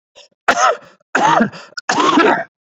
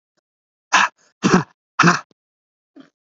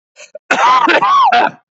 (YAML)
three_cough_length: 2.7 s
three_cough_amplitude: 30048
three_cough_signal_mean_std_ratio: 0.58
exhalation_length: 3.2 s
exhalation_amplitude: 32423
exhalation_signal_mean_std_ratio: 0.32
cough_length: 1.8 s
cough_amplitude: 28364
cough_signal_mean_std_ratio: 0.77
survey_phase: beta (2021-08-13 to 2022-03-07)
age: 18-44
gender: Male
wearing_mask: 'No'
symptom_fatigue: true
smoker_status: Never smoked
respiratory_condition_asthma: false
respiratory_condition_other: false
recruitment_source: Test and Trace
submission_delay: 0 days
covid_test_result: Negative
covid_test_method: LFT